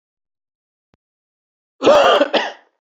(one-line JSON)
{"cough_length": "2.9 s", "cough_amplitude": 28141, "cough_signal_mean_std_ratio": 0.37, "survey_phase": "beta (2021-08-13 to 2022-03-07)", "age": "45-64", "gender": "Male", "wearing_mask": "No", "symptom_runny_or_blocked_nose": true, "symptom_onset": "10 days", "smoker_status": "Never smoked", "respiratory_condition_asthma": false, "respiratory_condition_other": false, "recruitment_source": "REACT", "submission_delay": "2 days", "covid_test_result": "Negative", "covid_test_method": "RT-qPCR", "influenza_a_test_result": "Negative", "influenza_b_test_result": "Negative"}